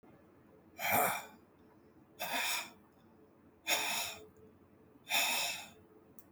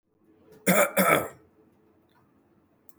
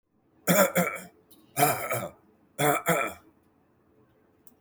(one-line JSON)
{"exhalation_length": "6.3 s", "exhalation_amplitude": 5186, "exhalation_signal_mean_std_ratio": 0.49, "cough_length": "3.0 s", "cough_amplitude": 17400, "cough_signal_mean_std_ratio": 0.35, "three_cough_length": "4.6 s", "three_cough_amplitude": 14276, "three_cough_signal_mean_std_ratio": 0.43, "survey_phase": "beta (2021-08-13 to 2022-03-07)", "age": "65+", "gender": "Male", "wearing_mask": "No", "symptom_none": true, "symptom_onset": "6 days", "smoker_status": "Never smoked", "respiratory_condition_asthma": false, "respiratory_condition_other": false, "recruitment_source": "REACT", "submission_delay": "2 days", "covid_test_result": "Negative", "covid_test_method": "RT-qPCR", "influenza_a_test_result": "Negative", "influenza_b_test_result": "Negative"}